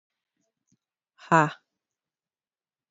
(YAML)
exhalation_length: 2.9 s
exhalation_amplitude: 17810
exhalation_signal_mean_std_ratio: 0.17
survey_phase: beta (2021-08-13 to 2022-03-07)
age: 18-44
gender: Female
wearing_mask: 'No'
symptom_cough_any: true
symptom_runny_or_blocked_nose: true
symptom_sore_throat: true
symptom_fatigue: true
symptom_headache: true
symptom_change_to_sense_of_smell_or_taste: true
symptom_onset: 3 days
smoker_status: Never smoked
respiratory_condition_asthma: false
respiratory_condition_other: false
recruitment_source: Test and Trace
submission_delay: 1 day
covid_test_result: Positive
covid_test_method: RT-qPCR
covid_ct_value: 24.6
covid_ct_gene: ORF1ab gene
covid_ct_mean: 25.1
covid_viral_load: 5700 copies/ml
covid_viral_load_category: Minimal viral load (< 10K copies/ml)